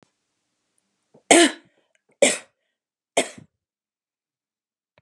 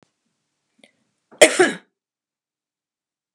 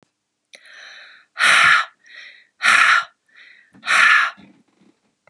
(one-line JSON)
{"three_cough_length": "5.0 s", "three_cough_amplitude": 32380, "three_cough_signal_mean_std_ratio": 0.21, "cough_length": "3.3 s", "cough_amplitude": 32768, "cough_signal_mean_std_ratio": 0.19, "exhalation_length": "5.3 s", "exhalation_amplitude": 31017, "exhalation_signal_mean_std_ratio": 0.43, "survey_phase": "beta (2021-08-13 to 2022-03-07)", "age": "65+", "gender": "Female", "wearing_mask": "No", "symptom_none": true, "smoker_status": "Never smoked", "respiratory_condition_asthma": false, "respiratory_condition_other": false, "recruitment_source": "REACT", "submission_delay": "1 day", "covid_test_result": "Negative", "covid_test_method": "RT-qPCR", "influenza_a_test_result": "Negative", "influenza_b_test_result": "Negative"}